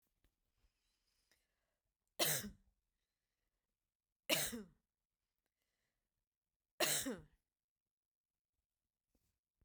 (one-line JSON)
{"three_cough_length": "9.6 s", "three_cough_amplitude": 3282, "three_cough_signal_mean_std_ratio": 0.24, "survey_phase": "beta (2021-08-13 to 2022-03-07)", "age": "65+", "gender": "Female", "wearing_mask": "No", "symptom_diarrhoea": true, "symptom_onset": "12 days", "smoker_status": "Never smoked", "respiratory_condition_asthma": false, "respiratory_condition_other": false, "recruitment_source": "REACT", "submission_delay": "3 days", "covid_test_result": "Negative", "covid_test_method": "RT-qPCR"}